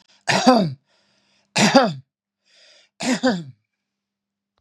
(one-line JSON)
{"three_cough_length": "4.6 s", "three_cough_amplitude": 32767, "three_cough_signal_mean_std_ratio": 0.39, "survey_phase": "beta (2021-08-13 to 2022-03-07)", "age": "65+", "gender": "Male", "wearing_mask": "No", "symptom_none": true, "smoker_status": "Never smoked", "respiratory_condition_asthma": false, "respiratory_condition_other": false, "recruitment_source": "REACT", "submission_delay": "2 days", "covid_test_result": "Negative", "covid_test_method": "RT-qPCR", "influenza_a_test_result": "Negative", "influenza_b_test_result": "Negative"}